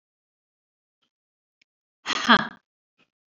{"exhalation_length": "3.3 s", "exhalation_amplitude": 25626, "exhalation_signal_mean_std_ratio": 0.19, "survey_phase": "beta (2021-08-13 to 2022-03-07)", "age": "45-64", "gender": "Female", "wearing_mask": "No", "symptom_cough_any": true, "symptom_runny_or_blocked_nose": true, "symptom_fatigue": true, "symptom_headache": true, "symptom_onset": "5 days", "smoker_status": "Ex-smoker", "respiratory_condition_asthma": false, "respiratory_condition_other": false, "recruitment_source": "Test and Trace", "submission_delay": "1 day", "covid_test_result": "Positive", "covid_test_method": "RT-qPCR"}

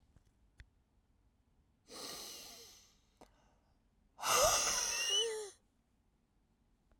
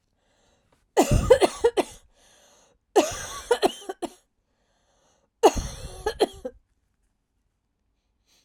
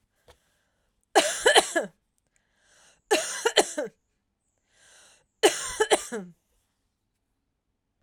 {"exhalation_length": "7.0 s", "exhalation_amplitude": 4042, "exhalation_signal_mean_std_ratio": 0.39, "cough_length": "8.4 s", "cough_amplitude": 22998, "cough_signal_mean_std_ratio": 0.3, "three_cough_length": "8.0 s", "three_cough_amplitude": 24068, "three_cough_signal_mean_std_ratio": 0.31, "survey_phase": "beta (2021-08-13 to 2022-03-07)", "age": "18-44", "gender": "Female", "wearing_mask": "Yes", "symptom_change_to_sense_of_smell_or_taste": true, "symptom_onset": "4 days", "smoker_status": "Never smoked", "respiratory_condition_asthma": false, "respiratory_condition_other": false, "recruitment_source": "Test and Trace", "submission_delay": "1 day", "covid_test_result": "Positive", "covid_test_method": "RT-qPCR", "covid_ct_value": 27.7, "covid_ct_gene": "ORF1ab gene"}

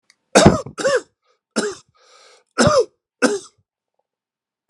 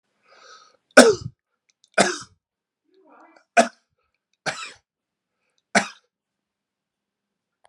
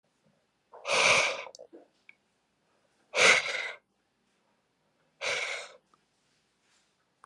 {"cough_length": "4.7 s", "cough_amplitude": 32768, "cough_signal_mean_std_ratio": 0.35, "three_cough_length": "7.7 s", "three_cough_amplitude": 32768, "three_cough_signal_mean_std_ratio": 0.2, "exhalation_length": "7.3 s", "exhalation_amplitude": 15698, "exhalation_signal_mean_std_ratio": 0.33, "survey_phase": "alpha (2021-03-01 to 2021-08-12)", "age": "45-64", "gender": "Male", "wearing_mask": "No", "symptom_none": true, "symptom_onset": "12 days", "smoker_status": "Ex-smoker", "respiratory_condition_asthma": false, "respiratory_condition_other": false, "recruitment_source": "REACT", "submission_delay": "2 days", "covid_test_result": "Negative", "covid_test_method": "RT-qPCR"}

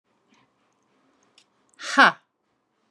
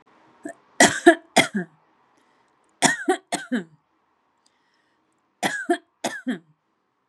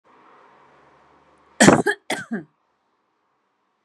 {"exhalation_length": "2.9 s", "exhalation_amplitude": 29230, "exhalation_signal_mean_std_ratio": 0.19, "three_cough_length": "7.1 s", "three_cough_amplitude": 32423, "three_cough_signal_mean_std_ratio": 0.3, "cough_length": "3.8 s", "cough_amplitude": 32768, "cough_signal_mean_std_ratio": 0.24, "survey_phase": "beta (2021-08-13 to 2022-03-07)", "age": "45-64", "gender": "Female", "wearing_mask": "No", "symptom_none": true, "smoker_status": "Ex-smoker", "respiratory_condition_asthma": false, "respiratory_condition_other": false, "recruitment_source": "REACT", "submission_delay": "1 day", "covid_test_result": "Negative", "covid_test_method": "RT-qPCR", "influenza_a_test_result": "Unknown/Void", "influenza_b_test_result": "Unknown/Void"}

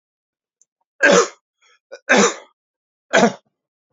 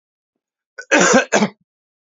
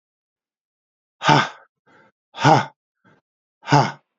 {"three_cough_length": "3.9 s", "three_cough_amplitude": 32767, "three_cough_signal_mean_std_ratio": 0.34, "cough_length": "2.0 s", "cough_amplitude": 32767, "cough_signal_mean_std_ratio": 0.4, "exhalation_length": "4.2 s", "exhalation_amplitude": 29600, "exhalation_signal_mean_std_ratio": 0.3, "survey_phase": "beta (2021-08-13 to 2022-03-07)", "age": "65+", "gender": "Male", "wearing_mask": "No", "symptom_runny_or_blocked_nose": true, "smoker_status": "Never smoked", "respiratory_condition_asthma": false, "respiratory_condition_other": false, "recruitment_source": "Test and Trace", "submission_delay": "1 day", "covid_test_result": "Positive", "covid_test_method": "RT-qPCR", "covid_ct_value": 20.5, "covid_ct_gene": "N gene", "covid_ct_mean": 21.4, "covid_viral_load": "98000 copies/ml", "covid_viral_load_category": "Low viral load (10K-1M copies/ml)"}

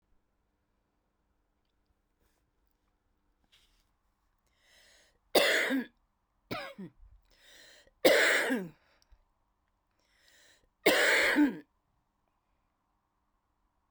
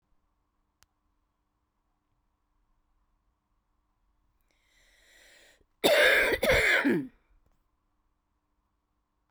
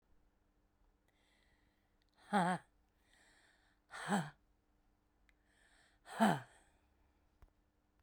{"three_cough_length": "13.9 s", "three_cough_amplitude": 11771, "three_cough_signal_mean_std_ratio": 0.3, "cough_length": "9.3 s", "cough_amplitude": 14182, "cough_signal_mean_std_ratio": 0.29, "exhalation_length": "8.0 s", "exhalation_amplitude": 4172, "exhalation_signal_mean_std_ratio": 0.25, "survey_phase": "beta (2021-08-13 to 2022-03-07)", "age": "18-44", "gender": "Female", "wearing_mask": "No", "symptom_cough_any": true, "symptom_runny_or_blocked_nose": true, "symptom_shortness_of_breath": true, "symptom_sore_throat": true, "symptom_abdominal_pain": true, "symptom_fatigue": true, "symptom_fever_high_temperature": true, "symptom_headache": true, "symptom_loss_of_taste": true, "symptom_other": true, "symptom_onset": "3 days", "smoker_status": "Never smoked", "respiratory_condition_asthma": true, "respiratory_condition_other": false, "recruitment_source": "Test and Trace", "submission_delay": "2 days", "covid_test_result": "Positive", "covid_test_method": "RT-qPCR"}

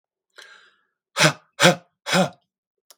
{"exhalation_length": "3.0 s", "exhalation_amplitude": 32732, "exhalation_signal_mean_std_ratio": 0.31, "survey_phase": "beta (2021-08-13 to 2022-03-07)", "age": "18-44", "gender": "Male", "wearing_mask": "No", "symptom_none": true, "smoker_status": "Never smoked", "respiratory_condition_asthma": false, "respiratory_condition_other": false, "recruitment_source": "REACT", "submission_delay": "4 days", "covid_test_result": "Negative", "covid_test_method": "RT-qPCR", "influenza_a_test_result": "Negative", "influenza_b_test_result": "Negative"}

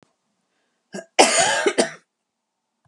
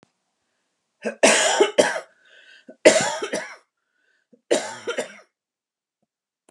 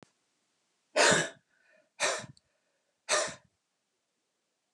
{"cough_length": "2.9 s", "cough_amplitude": 32234, "cough_signal_mean_std_ratio": 0.36, "three_cough_length": "6.5 s", "three_cough_amplitude": 32768, "three_cough_signal_mean_std_ratio": 0.35, "exhalation_length": "4.7 s", "exhalation_amplitude": 9687, "exhalation_signal_mean_std_ratio": 0.3, "survey_phase": "beta (2021-08-13 to 2022-03-07)", "age": "45-64", "gender": "Female", "wearing_mask": "No", "symptom_none": true, "symptom_onset": "8 days", "smoker_status": "Ex-smoker", "respiratory_condition_asthma": false, "respiratory_condition_other": false, "recruitment_source": "REACT", "submission_delay": "1 day", "covid_test_result": "Negative", "covid_test_method": "RT-qPCR"}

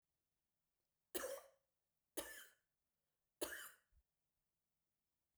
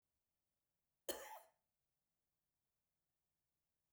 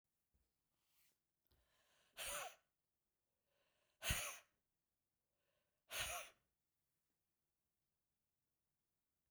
{"three_cough_length": "5.4 s", "three_cough_amplitude": 1222, "three_cough_signal_mean_std_ratio": 0.29, "cough_length": "3.9 s", "cough_amplitude": 987, "cough_signal_mean_std_ratio": 0.2, "exhalation_length": "9.3 s", "exhalation_amplitude": 1459, "exhalation_signal_mean_std_ratio": 0.26, "survey_phase": "beta (2021-08-13 to 2022-03-07)", "age": "65+", "gender": "Female", "wearing_mask": "No", "symptom_none": true, "smoker_status": "Ex-smoker", "respiratory_condition_asthma": false, "respiratory_condition_other": false, "recruitment_source": "REACT", "submission_delay": "1 day", "covid_test_result": "Negative", "covid_test_method": "RT-qPCR"}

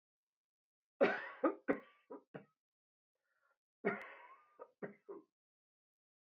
{"cough_length": "6.3 s", "cough_amplitude": 3478, "cough_signal_mean_std_ratio": 0.26, "survey_phase": "beta (2021-08-13 to 2022-03-07)", "age": "45-64", "gender": "Male", "wearing_mask": "No", "symptom_cough_any": true, "symptom_new_continuous_cough": true, "symptom_runny_or_blocked_nose": true, "symptom_fatigue": true, "symptom_headache": true, "symptom_change_to_sense_of_smell_or_taste": true, "symptom_onset": "5 days", "smoker_status": "Never smoked", "respiratory_condition_asthma": false, "respiratory_condition_other": false, "recruitment_source": "Test and Trace", "submission_delay": "2 days", "covid_test_result": "Positive", "covid_test_method": "RT-qPCR"}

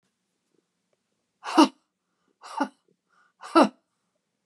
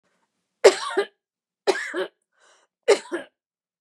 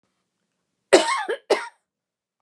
{"exhalation_length": "4.5 s", "exhalation_amplitude": 23579, "exhalation_signal_mean_std_ratio": 0.21, "three_cough_length": "3.8 s", "three_cough_amplitude": 31826, "three_cough_signal_mean_std_ratio": 0.29, "cough_length": "2.4 s", "cough_amplitude": 32768, "cough_signal_mean_std_ratio": 0.3, "survey_phase": "beta (2021-08-13 to 2022-03-07)", "age": "45-64", "gender": "Female", "wearing_mask": "No", "symptom_none": true, "smoker_status": "Never smoked", "respiratory_condition_asthma": false, "respiratory_condition_other": false, "recruitment_source": "REACT", "submission_delay": "1 day", "covid_test_result": "Negative", "covid_test_method": "RT-qPCR", "influenza_a_test_result": "Negative", "influenza_b_test_result": "Negative"}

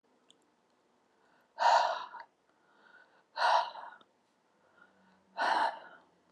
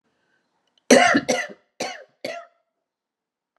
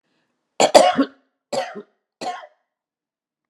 {"exhalation_length": "6.3 s", "exhalation_amplitude": 6778, "exhalation_signal_mean_std_ratio": 0.36, "cough_length": "3.6 s", "cough_amplitude": 31061, "cough_signal_mean_std_ratio": 0.3, "three_cough_length": "3.5 s", "three_cough_amplitude": 32768, "three_cough_signal_mean_std_ratio": 0.29, "survey_phase": "alpha (2021-03-01 to 2021-08-12)", "age": "65+", "gender": "Female", "wearing_mask": "No", "symptom_none": true, "smoker_status": "Ex-smoker", "respiratory_condition_asthma": false, "respiratory_condition_other": false, "recruitment_source": "REACT", "submission_delay": "2 days", "covid_test_result": "Negative", "covid_test_method": "RT-qPCR"}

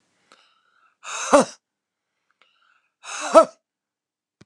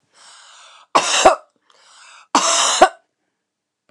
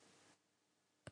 {"exhalation_length": "4.5 s", "exhalation_amplitude": 29204, "exhalation_signal_mean_std_ratio": 0.22, "three_cough_length": "3.9 s", "three_cough_amplitude": 29204, "three_cough_signal_mean_std_ratio": 0.37, "cough_length": "1.1 s", "cough_amplitude": 432, "cough_signal_mean_std_ratio": 0.38, "survey_phase": "beta (2021-08-13 to 2022-03-07)", "age": "65+", "gender": "Female", "wearing_mask": "No", "symptom_runny_or_blocked_nose": true, "smoker_status": "Never smoked", "respiratory_condition_asthma": true, "respiratory_condition_other": false, "recruitment_source": "Test and Trace", "submission_delay": "2 days", "covid_test_result": "Positive", "covid_test_method": "RT-qPCR", "covid_ct_value": 27.9, "covid_ct_gene": "ORF1ab gene", "covid_ct_mean": 28.9, "covid_viral_load": "340 copies/ml", "covid_viral_load_category": "Minimal viral load (< 10K copies/ml)"}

